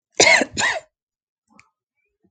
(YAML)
cough_length: 2.3 s
cough_amplitude: 32768
cough_signal_mean_std_ratio: 0.34
survey_phase: alpha (2021-03-01 to 2021-08-12)
age: 18-44
gender: Female
wearing_mask: 'No'
symptom_none: true
smoker_status: Never smoked
respiratory_condition_asthma: false
respiratory_condition_other: false
recruitment_source: REACT
submission_delay: 2 days
covid_test_result: Negative
covid_test_method: RT-qPCR